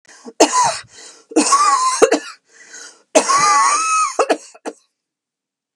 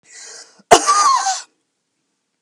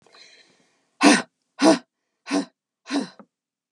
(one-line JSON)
{"three_cough_length": "5.8 s", "three_cough_amplitude": 32768, "three_cough_signal_mean_std_ratio": 0.56, "cough_length": "2.4 s", "cough_amplitude": 32768, "cough_signal_mean_std_ratio": 0.41, "exhalation_length": "3.7 s", "exhalation_amplitude": 28929, "exhalation_signal_mean_std_ratio": 0.31, "survey_phase": "beta (2021-08-13 to 2022-03-07)", "age": "45-64", "gender": "Female", "wearing_mask": "No", "symptom_runny_or_blocked_nose": true, "symptom_headache": true, "smoker_status": "Never smoked", "respiratory_condition_asthma": false, "respiratory_condition_other": false, "recruitment_source": "REACT", "submission_delay": "1 day", "covid_test_result": "Negative", "covid_test_method": "RT-qPCR", "influenza_a_test_result": "Negative", "influenza_b_test_result": "Negative"}